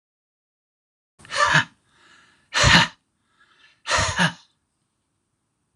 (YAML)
exhalation_length: 5.8 s
exhalation_amplitude: 26028
exhalation_signal_mean_std_ratio: 0.33
survey_phase: alpha (2021-03-01 to 2021-08-12)
age: 45-64
gender: Male
wearing_mask: 'No'
symptom_none: true
smoker_status: Ex-smoker
respiratory_condition_asthma: false
respiratory_condition_other: false
recruitment_source: REACT
submission_delay: 2 days
covid_test_result: Negative
covid_test_method: RT-qPCR